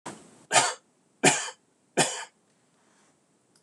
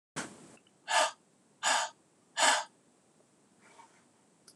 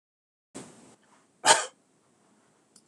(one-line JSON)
{"three_cough_length": "3.6 s", "three_cough_amplitude": 20174, "three_cough_signal_mean_std_ratio": 0.32, "exhalation_length": "4.6 s", "exhalation_amplitude": 9104, "exhalation_signal_mean_std_ratio": 0.35, "cough_length": "2.9 s", "cough_amplitude": 20919, "cough_signal_mean_std_ratio": 0.2, "survey_phase": "beta (2021-08-13 to 2022-03-07)", "age": "45-64", "gender": "Male", "wearing_mask": "No", "symptom_sore_throat": true, "symptom_onset": "10 days", "smoker_status": "Never smoked", "respiratory_condition_asthma": false, "respiratory_condition_other": false, "recruitment_source": "REACT", "submission_delay": "2 days", "covid_test_result": "Negative", "covid_test_method": "RT-qPCR", "influenza_a_test_result": "Negative", "influenza_b_test_result": "Negative"}